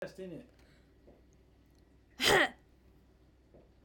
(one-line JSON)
{"cough_length": "3.8 s", "cough_amplitude": 7602, "cough_signal_mean_std_ratio": 0.28, "survey_phase": "beta (2021-08-13 to 2022-03-07)", "age": "45-64", "gender": "Female", "wearing_mask": "No", "symptom_none": true, "smoker_status": "Never smoked", "respiratory_condition_asthma": false, "respiratory_condition_other": false, "recruitment_source": "REACT", "submission_delay": "3 days", "covid_test_result": "Negative", "covid_test_method": "RT-qPCR"}